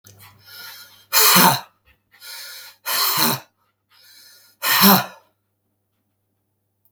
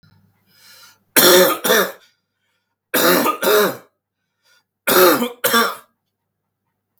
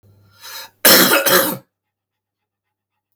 {"exhalation_length": "6.9 s", "exhalation_amplitude": 32768, "exhalation_signal_mean_std_ratio": 0.37, "three_cough_length": "7.0 s", "three_cough_amplitude": 32768, "three_cough_signal_mean_std_ratio": 0.45, "cough_length": "3.2 s", "cough_amplitude": 32768, "cough_signal_mean_std_ratio": 0.38, "survey_phase": "beta (2021-08-13 to 2022-03-07)", "age": "45-64", "gender": "Male", "wearing_mask": "No", "symptom_cough_any": true, "symptom_runny_or_blocked_nose": true, "symptom_shortness_of_breath": true, "symptom_onset": "12 days", "smoker_status": "Never smoked", "respiratory_condition_asthma": false, "respiratory_condition_other": false, "recruitment_source": "REACT", "submission_delay": "5 days", "covid_test_result": "Negative", "covid_test_method": "RT-qPCR", "influenza_a_test_result": "Negative", "influenza_b_test_result": "Negative"}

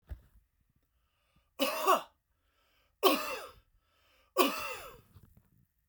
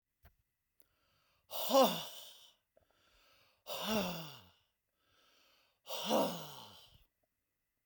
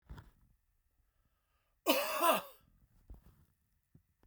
{"three_cough_length": "5.9 s", "three_cough_amplitude": 9635, "three_cough_signal_mean_std_ratio": 0.32, "exhalation_length": "7.9 s", "exhalation_amplitude": 5201, "exhalation_signal_mean_std_ratio": 0.33, "cough_length": "4.3 s", "cough_amplitude": 6702, "cough_signal_mean_std_ratio": 0.3, "survey_phase": "beta (2021-08-13 to 2022-03-07)", "age": "45-64", "gender": "Male", "wearing_mask": "No", "symptom_none": true, "smoker_status": "Never smoked", "respiratory_condition_asthma": false, "respiratory_condition_other": false, "recruitment_source": "REACT", "submission_delay": "2 days", "covid_test_result": "Negative", "covid_test_method": "RT-qPCR", "influenza_a_test_result": "Negative", "influenza_b_test_result": "Negative"}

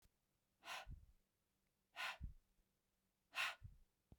{"exhalation_length": "4.2 s", "exhalation_amplitude": 968, "exhalation_signal_mean_std_ratio": 0.37, "survey_phase": "beta (2021-08-13 to 2022-03-07)", "age": "45-64", "gender": "Female", "wearing_mask": "No", "symptom_none": true, "smoker_status": "Ex-smoker", "respiratory_condition_asthma": false, "respiratory_condition_other": false, "recruitment_source": "Test and Trace", "submission_delay": "1 day", "covid_test_result": "Negative", "covid_test_method": "RT-qPCR"}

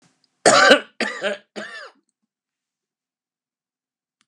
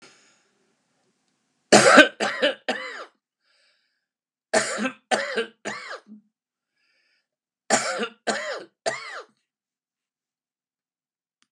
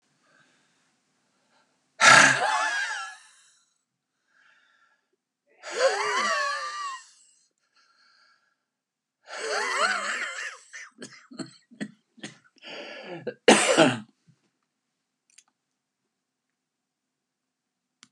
{"cough_length": "4.3 s", "cough_amplitude": 32768, "cough_signal_mean_std_ratio": 0.28, "three_cough_length": "11.5 s", "three_cough_amplitude": 32767, "three_cough_signal_mean_std_ratio": 0.29, "exhalation_length": "18.1 s", "exhalation_amplitude": 26442, "exhalation_signal_mean_std_ratio": 0.32, "survey_phase": "beta (2021-08-13 to 2022-03-07)", "age": "65+", "gender": "Male", "wearing_mask": "No", "symptom_none": true, "smoker_status": "Ex-smoker", "respiratory_condition_asthma": false, "respiratory_condition_other": false, "recruitment_source": "REACT", "submission_delay": "8 days", "covid_test_result": "Negative", "covid_test_method": "RT-qPCR"}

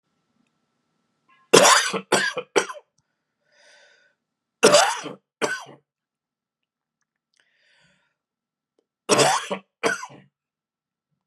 {"three_cough_length": "11.3 s", "three_cough_amplitude": 32378, "three_cough_signal_mean_std_ratio": 0.29, "survey_phase": "beta (2021-08-13 to 2022-03-07)", "age": "45-64", "gender": "Female", "wearing_mask": "No", "symptom_cough_any": true, "symptom_runny_or_blocked_nose": true, "symptom_sore_throat": true, "symptom_fatigue": true, "symptom_headache": true, "symptom_change_to_sense_of_smell_or_taste": true, "smoker_status": "Ex-smoker", "respiratory_condition_asthma": false, "respiratory_condition_other": false, "recruitment_source": "Test and Trace", "submission_delay": "2 days", "covid_test_result": "Negative", "covid_test_method": "RT-qPCR"}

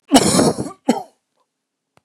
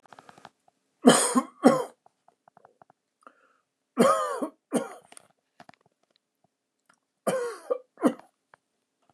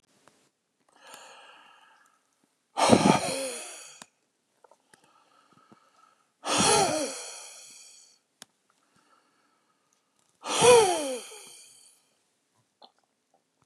{"cough_length": "2.0 s", "cough_amplitude": 32535, "cough_signal_mean_std_ratio": 0.42, "three_cough_length": "9.1 s", "three_cough_amplitude": 27079, "three_cough_signal_mean_std_ratio": 0.29, "exhalation_length": "13.7 s", "exhalation_amplitude": 23374, "exhalation_signal_mean_std_ratio": 0.3, "survey_phase": "beta (2021-08-13 to 2022-03-07)", "age": "45-64", "gender": "Male", "wearing_mask": "No", "symptom_none": true, "smoker_status": "Ex-smoker", "respiratory_condition_asthma": false, "respiratory_condition_other": false, "recruitment_source": "REACT", "submission_delay": "1 day", "covid_test_result": "Negative", "covid_test_method": "RT-qPCR", "influenza_a_test_result": "Negative", "influenza_b_test_result": "Negative"}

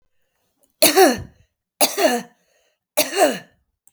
{"three_cough_length": "3.9 s", "three_cough_amplitude": 32768, "three_cough_signal_mean_std_ratio": 0.39, "survey_phase": "beta (2021-08-13 to 2022-03-07)", "age": "45-64", "gender": "Female", "wearing_mask": "No", "symptom_none": true, "smoker_status": "Ex-smoker", "respiratory_condition_asthma": false, "respiratory_condition_other": false, "recruitment_source": "REACT", "submission_delay": "1 day", "covid_test_result": "Negative", "covid_test_method": "RT-qPCR", "influenza_a_test_result": "Negative", "influenza_b_test_result": "Negative"}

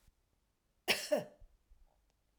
{"cough_length": "2.4 s", "cough_amplitude": 5388, "cough_signal_mean_std_ratio": 0.28, "survey_phase": "alpha (2021-03-01 to 2021-08-12)", "age": "45-64", "gender": "Female", "wearing_mask": "No", "symptom_none": true, "smoker_status": "Never smoked", "respiratory_condition_asthma": false, "respiratory_condition_other": false, "recruitment_source": "REACT", "submission_delay": "1 day", "covid_test_result": "Negative", "covid_test_method": "RT-qPCR"}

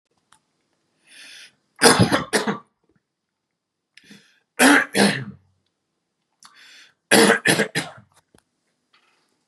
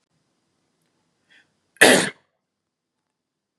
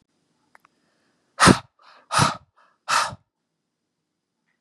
{"three_cough_length": "9.5 s", "three_cough_amplitude": 32768, "three_cough_signal_mean_std_ratio": 0.32, "cough_length": "3.6 s", "cough_amplitude": 32768, "cough_signal_mean_std_ratio": 0.2, "exhalation_length": "4.6 s", "exhalation_amplitude": 32767, "exhalation_signal_mean_std_ratio": 0.25, "survey_phase": "beta (2021-08-13 to 2022-03-07)", "age": "18-44", "gender": "Male", "wearing_mask": "No", "symptom_cough_any": true, "symptom_sore_throat": true, "smoker_status": "Never smoked", "respiratory_condition_asthma": false, "respiratory_condition_other": false, "recruitment_source": "Test and Trace", "submission_delay": "0 days", "covid_test_result": "Positive", "covid_test_method": "RT-qPCR", "covid_ct_value": 29.7, "covid_ct_gene": "N gene"}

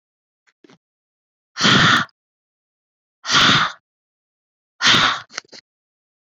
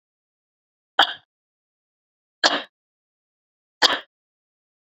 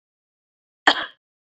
{"exhalation_length": "6.2 s", "exhalation_amplitude": 32282, "exhalation_signal_mean_std_ratio": 0.37, "three_cough_length": "4.9 s", "three_cough_amplitude": 32767, "three_cough_signal_mean_std_ratio": 0.2, "cough_length": "1.5 s", "cough_amplitude": 27724, "cough_signal_mean_std_ratio": 0.2, "survey_phase": "beta (2021-08-13 to 2022-03-07)", "age": "45-64", "gender": "Female", "wearing_mask": "No", "symptom_runny_or_blocked_nose": true, "symptom_headache": true, "smoker_status": "Current smoker (e-cigarettes or vapes only)", "respiratory_condition_asthma": false, "respiratory_condition_other": false, "recruitment_source": "Test and Trace", "submission_delay": "1 day", "covid_test_result": "Positive", "covid_test_method": "RT-qPCR", "covid_ct_value": 16.9, "covid_ct_gene": "ORF1ab gene", "covid_ct_mean": 17.4, "covid_viral_load": "1900000 copies/ml", "covid_viral_load_category": "High viral load (>1M copies/ml)"}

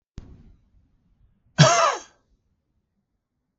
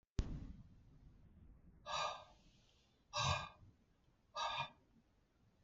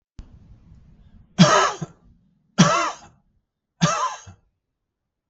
{"cough_length": "3.6 s", "cough_amplitude": 32766, "cough_signal_mean_std_ratio": 0.26, "exhalation_length": "5.6 s", "exhalation_amplitude": 2087, "exhalation_signal_mean_std_ratio": 0.42, "three_cough_length": "5.3 s", "three_cough_amplitude": 32549, "three_cough_signal_mean_std_ratio": 0.34, "survey_phase": "beta (2021-08-13 to 2022-03-07)", "age": "65+", "gender": "Male", "wearing_mask": "No", "symptom_none": true, "smoker_status": "Ex-smoker", "respiratory_condition_asthma": false, "respiratory_condition_other": false, "recruitment_source": "REACT", "submission_delay": "2 days", "covid_test_result": "Negative", "covid_test_method": "RT-qPCR"}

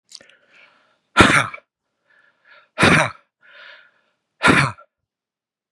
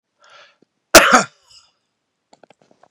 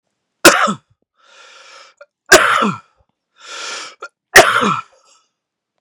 {"exhalation_length": "5.7 s", "exhalation_amplitude": 32768, "exhalation_signal_mean_std_ratio": 0.31, "cough_length": "2.9 s", "cough_amplitude": 32768, "cough_signal_mean_std_ratio": 0.23, "three_cough_length": "5.8 s", "three_cough_amplitude": 32768, "three_cough_signal_mean_std_ratio": 0.34, "survey_phase": "beta (2021-08-13 to 2022-03-07)", "age": "45-64", "gender": "Male", "wearing_mask": "No", "symptom_runny_or_blocked_nose": true, "symptom_diarrhoea": true, "symptom_other": true, "smoker_status": "Ex-smoker", "respiratory_condition_asthma": true, "respiratory_condition_other": false, "recruitment_source": "Test and Trace", "submission_delay": "1 day", "covid_test_result": "Negative", "covid_test_method": "RT-qPCR"}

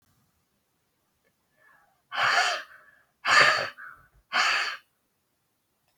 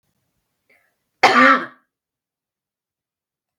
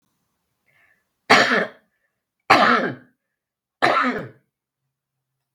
{"exhalation_length": "6.0 s", "exhalation_amplitude": 18684, "exhalation_signal_mean_std_ratio": 0.37, "cough_length": "3.6 s", "cough_amplitude": 32768, "cough_signal_mean_std_ratio": 0.26, "three_cough_length": "5.5 s", "three_cough_amplitude": 32768, "three_cough_signal_mean_std_ratio": 0.35, "survey_phase": "beta (2021-08-13 to 2022-03-07)", "age": "65+", "gender": "Female", "wearing_mask": "No", "symptom_none": true, "smoker_status": "Ex-smoker", "respiratory_condition_asthma": false, "respiratory_condition_other": false, "recruitment_source": "Test and Trace", "submission_delay": "0 days", "covid_test_result": "Negative", "covid_test_method": "LFT"}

